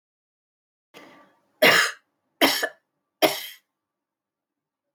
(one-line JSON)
{"three_cough_length": "4.9 s", "three_cough_amplitude": 20783, "three_cough_signal_mean_std_ratio": 0.28, "survey_phase": "beta (2021-08-13 to 2022-03-07)", "age": "45-64", "gender": "Female", "wearing_mask": "No", "symptom_cough_any": true, "symptom_shortness_of_breath": true, "symptom_sore_throat": true, "symptom_diarrhoea": true, "symptom_fatigue": true, "symptom_headache": true, "symptom_onset": "1 day", "smoker_status": "Never smoked", "respiratory_condition_asthma": false, "respiratory_condition_other": true, "recruitment_source": "Test and Trace", "submission_delay": "1 day", "covid_test_result": "Positive", "covid_test_method": "RT-qPCR", "covid_ct_value": 23.6, "covid_ct_gene": "N gene"}